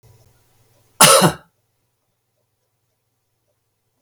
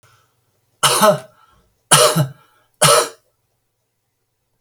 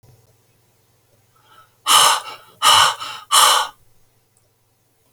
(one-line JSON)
{"cough_length": "4.0 s", "cough_amplitude": 32768, "cough_signal_mean_std_ratio": 0.23, "three_cough_length": "4.6 s", "three_cough_amplitude": 32768, "three_cough_signal_mean_std_ratio": 0.37, "exhalation_length": "5.1 s", "exhalation_amplitude": 32768, "exhalation_signal_mean_std_ratio": 0.38, "survey_phase": "beta (2021-08-13 to 2022-03-07)", "age": "65+", "gender": "Male", "wearing_mask": "No", "symptom_none": true, "smoker_status": "Ex-smoker", "respiratory_condition_asthma": false, "respiratory_condition_other": false, "recruitment_source": "REACT", "submission_delay": "1 day", "covid_test_result": "Negative", "covid_test_method": "RT-qPCR"}